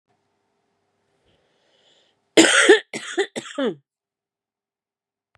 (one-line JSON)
{"cough_length": "5.4 s", "cough_amplitude": 31939, "cough_signal_mean_std_ratio": 0.27, "survey_phase": "beta (2021-08-13 to 2022-03-07)", "age": "45-64", "gender": "Female", "wearing_mask": "Yes", "symptom_new_continuous_cough": true, "symptom_runny_or_blocked_nose": true, "symptom_fatigue": true, "symptom_onset": "2 days", "smoker_status": "Ex-smoker", "respiratory_condition_asthma": false, "respiratory_condition_other": false, "recruitment_source": "Test and Trace", "submission_delay": "1 day", "covid_test_result": "Positive", "covid_test_method": "RT-qPCR", "covid_ct_value": 24.2, "covid_ct_gene": "N gene", "covid_ct_mean": 24.5, "covid_viral_load": "9000 copies/ml", "covid_viral_load_category": "Minimal viral load (< 10K copies/ml)"}